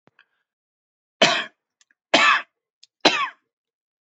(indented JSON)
{
  "three_cough_length": "4.2 s",
  "three_cough_amplitude": 32676,
  "three_cough_signal_mean_std_ratio": 0.31,
  "survey_phase": "beta (2021-08-13 to 2022-03-07)",
  "age": "45-64",
  "gender": "Male",
  "wearing_mask": "No",
  "symptom_cough_any": true,
  "symptom_runny_or_blocked_nose": true,
  "symptom_sore_throat": true,
  "symptom_fatigue": true,
  "symptom_headache": true,
  "smoker_status": "Ex-smoker",
  "respiratory_condition_asthma": false,
  "respiratory_condition_other": false,
  "recruitment_source": "Test and Trace",
  "submission_delay": "2 days",
  "covid_test_result": "Positive",
  "covid_test_method": "LFT"
}